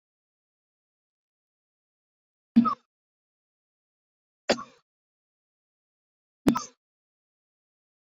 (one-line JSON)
{"three_cough_length": "8.0 s", "three_cough_amplitude": 12701, "three_cough_signal_mean_std_ratio": 0.16, "survey_phase": "beta (2021-08-13 to 2022-03-07)", "age": "45-64", "gender": "Male", "wearing_mask": "No", "symptom_none": true, "smoker_status": "Never smoked", "respiratory_condition_asthma": false, "respiratory_condition_other": true, "recruitment_source": "REACT", "submission_delay": "1 day", "covid_test_result": "Negative", "covid_test_method": "RT-qPCR", "influenza_a_test_result": "Negative", "influenza_b_test_result": "Negative"}